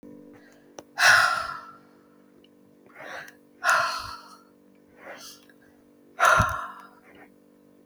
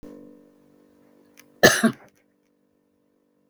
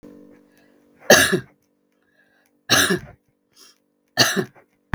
{"exhalation_length": "7.9 s", "exhalation_amplitude": 17994, "exhalation_signal_mean_std_ratio": 0.36, "cough_length": "3.5 s", "cough_amplitude": 32766, "cough_signal_mean_std_ratio": 0.21, "three_cough_length": "4.9 s", "three_cough_amplitude": 32768, "three_cough_signal_mean_std_ratio": 0.31, "survey_phase": "beta (2021-08-13 to 2022-03-07)", "age": "45-64", "gender": "Female", "wearing_mask": "No", "symptom_none": true, "smoker_status": "Never smoked", "respiratory_condition_asthma": false, "respiratory_condition_other": false, "recruitment_source": "REACT", "submission_delay": "6 days", "covid_test_result": "Negative", "covid_test_method": "RT-qPCR", "influenza_a_test_result": "Negative", "influenza_b_test_result": "Negative"}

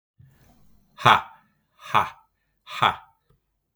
{"exhalation_length": "3.8 s", "exhalation_amplitude": 32768, "exhalation_signal_mean_std_ratio": 0.26, "survey_phase": "beta (2021-08-13 to 2022-03-07)", "age": "45-64", "gender": "Male", "wearing_mask": "No", "symptom_cough_any": true, "symptom_sore_throat": true, "smoker_status": "Ex-smoker", "respiratory_condition_asthma": false, "respiratory_condition_other": false, "recruitment_source": "REACT", "submission_delay": "14 days", "covid_test_result": "Negative", "covid_test_method": "RT-qPCR"}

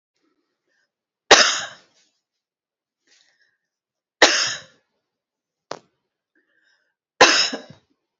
{"three_cough_length": "8.2 s", "three_cough_amplitude": 32767, "three_cough_signal_mean_std_ratio": 0.24, "survey_phase": "beta (2021-08-13 to 2022-03-07)", "age": "45-64", "gender": "Female", "wearing_mask": "No", "symptom_new_continuous_cough": true, "symptom_shortness_of_breath": true, "symptom_onset": "3 days", "smoker_status": "Never smoked", "respiratory_condition_asthma": true, "respiratory_condition_other": false, "recruitment_source": "Test and Trace", "submission_delay": "2 days", "covid_test_result": "Positive", "covid_test_method": "ePCR"}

